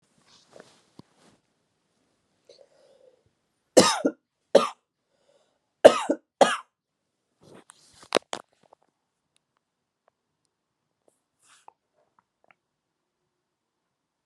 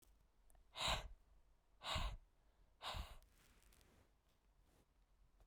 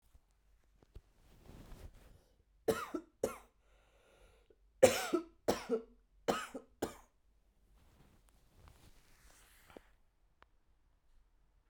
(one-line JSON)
{"cough_length": "14.3 s", "cough_amplitude": 32768, "cough_signal_mean_std_ratio": 0.15, "exhalation_length": "5.5 s", "exhalation_amplitude": 1271, "exhalation_signal_mean_std_ratio": 0.39, "three_cough_length": "11.7 s", "three_cough_amplitude": 9706, "three_cough_signal_mean_std_ratio": 0.24, "survey_phase": "beta (2021-08-13 to 2022-03-07)", "age": "18-44", "gender": "Female", "wearing_mask": "No", "symptom_cough_any": true, "symptom_runny_or_blocked_nose": true, "symptom_change_to_sense_of_smell_or_taste": true, "symptom_onset": "10 days", "smoker_status": "Never smoked", "respiratory_condition_asthma": false, "respiratory_condition_other": false, "recruitment_source": "Test and Trace", "submission_delay": "2 days", "covid_test_result": "Positive", "covid_test_method": "RT-qPCR", "covid_ct_value": 20.8, "covid_ct_gene": "ORF1ab gene", "covid_ct_mean": 21.1, "covid_viral_load": "120000 copies/ml", "covid_viral_load_category": "Low viral load (10K-1M copies/ml)"}